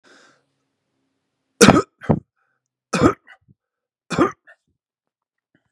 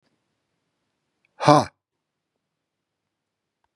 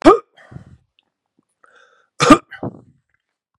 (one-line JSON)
{"three_cough_length": "5.7 s", "three_cough_amplitude": 32768, "three_cough_signal_mean_std_ratio": 0.24, "exhalation_length": "3.8 s", "exhalation_amplitude": 32739, "exhalation_signal_mean_std_ratio": 0.16, "cough_length": "3.6 s", "cough_amplitude": 32768, "cough_signal_mean_std_ratio": 0.24, "survey_phase": "beta (2021-08-13 to 2022-03-07)", "age": "65+", "gender": "Male", "wearing_mask": "No", "symptom_cough_any": true, "symptom_runny_or_blocked_nose": true, "smoker_status": "Never smoked", "respiratory_condition_asthma": false, "respiratory_condition_other": false, "recruitment_source": "REACT", "submission_delay": "1 day", "covid_test_result": "Negative", "covid_test_method": "RT-qPCR", "influenza_a_test_result": "Negative", "influenza_b_test_result": "Negative"}